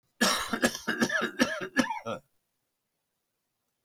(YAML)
cough_length: 3.8 s
cough_amplitude: 13183
cough_signal_mean_std_ratio: 0.47
survey_phase: beta (2021-08-13 to 2022-03-07)
age: 65+
gender: Male
wearing_mask: 'No'
symptom_none: true
smoker_status: Current smoker (1 to 10 cigarettes per day)
respiratory_condition_asthma: false
respiratory_condition_other: false
recruitment_source: REACT
submission_delay: 1 day
covid_test_result: Negative
covid_test_method: RT-qPCR